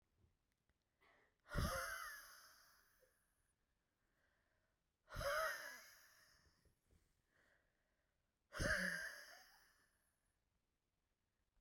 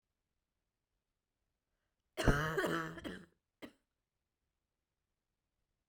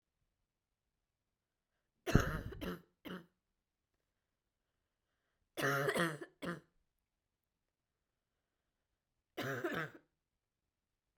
{"exhalation_length": "11.6 s", "exhalation_amplitude": 1157, "exhalation_signal_mean_std_ratio": 0.35, "cough_length": "5.9 s", "cough_amplitude": 4641, "cough_signal_mean_std_ratio": 0.27, "three_cough_length": "11.2 s", "three_cough_amplitude": 6879, "three_cough_signal_mean_std_ratio": 0.29, "survey_phase": "beta (2021-08-13 to 2022-03-07)", "age": "18-44", "gender": "Female", "wearing_mask": "No", "symptom_cough_any": true, "symptom_new_continuous_cough": true, "symptom_runny_or_blocked_nose": true, "symptom_shortness_of_breath": true, "symptom_fatigue": true, "symptom_fever_high_temperature": true, "symptom_headache": true, "symptom_change_to_sense_of_smell_or_taste": true, "symptom_loss_of_taste": true, "symptom_onset": "6 days", "smoker_status": "Never smoked", "respiratory_condition_asthma": true, "respiratory_condition_other": false, "recruitment_source": "Test and Trace", "submission_delay": "4 days", "covid_test_result": "Positive", "covid_test_method": "RT-qPCR"}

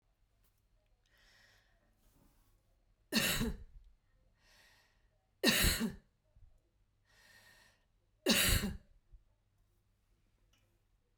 {"three_cough_length": "11.2 s", "three_cough_amplitude": 7193, "three_cough_signal_mean_std_ratio": 0.3, "survey_phase": "beta (2021-08-13 to 2022-03-07)", "age": "45-64", "gender": "Female", "wearing_mask": "No", "symptom_none": true, "smoker_status": "Ex-smoker", "respiratory_condition_asthma": false, "respiratory_condition_other": false, "recruitment_source": "REACT", "submission_delay": "2 days", "covid_test_result": "Negative", "covid_test_method": "RT-qPCR"}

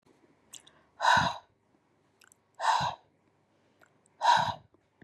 {"exhalation_length": "5.0 s", "exhalation_amplitude": 8391, "exhalation_signal_mean_std_ratio": 0.35, "survey_phase": "beta (2021-08-13 to 2022-03-07)", "age": "18-44", "gender": "Female", "wearing_mask": "No", "symptom_none": true, "smoker_status": "Never smoked", "respiratory_condition_asthma": false, "respiratory_condition_other": false, "recruitment_source": "Test and Trace", "submission_delay": "1 day", "covid_test_result": "Negative", "covid_test_method": "RT-qPCR"}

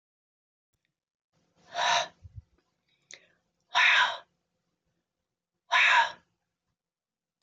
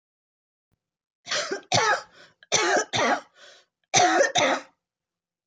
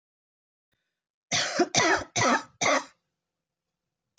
{"exhalation_length": "7.4 s", "exhalation_amplitude": 10409, "exhalation_signal_mean_std_ratio": 0.31, "three_cough_length": "5.5 s", "three_cough_amplitude": 18909, "three_cough_signal_mean_std_ratio": 0.48, "cough_length": "4.2 s", "cough_amplitude": 13902, "cough_signal_mean_std_ratio": 0.41, "survey_phase": "alpha (2021-03-01 to 2021-08-12)", "age": "65+", "gender": "Female", "wearing_mask": "No", "symptom_none": true, "smoker_status": "Never smoked", "respiratory_condition_asthma": false, "respiratory_condition_other": false, "recruitment_source": "REACT", "submission_delay": "1 day", "covid_test_result": "Negative", "covid_test_method": "RT-qPCR"}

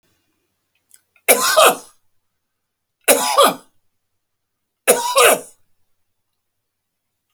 {"three_cough_length": "7.3 s", "three_cough_amplitude": 32768, "three_cough_signal_mean_std_ratio": 0.33, "survey_phase": "beta (2021-08-13 to 2022-03-07)", "age": "45-64", "gender": "Male", "wearing_mask": "No", "symptom_none": true, "smoker_status": "Never smoked", "respiratory_condition_asthma": false, "respiratory_condition_other": false, "recruitment_source": "REACT", "submission_delay": "1 day", "covid_test_result": "Negative", "covid_test_method": "RT-qPCR"}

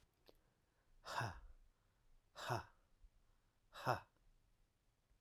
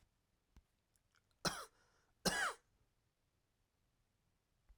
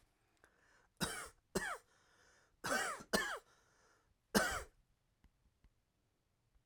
{"exhalation_length": "5.2 s", "exhalation_amplitude": 2266, "exhalation_signal_mean_std_ratio": 0.32, "cough_length": "4.8 s", "cough_amplitude": 2440, "cough_signal_mean_std_ratio": 0.24, "three_cough_length": "6.7 s", "three_cough_amplitude": 4745, "three_cough_signal_mean_std_ratio": 0.34, "survey_phase": "alpha (2021-03-01 to 2021-08-12)", "age": "45-64", "gender": "Male", "wearing_mask": "No", "symptom_none": true, "smoker_status": "Ex-smoker", "respiratory_condition_asthma": false, "respiratory_condition_other": false, "recruitment_source": "REACT", "submission_delay": "1 day", "covid_test_result": "Negative", "covid_test_method": "RT-qPCR"}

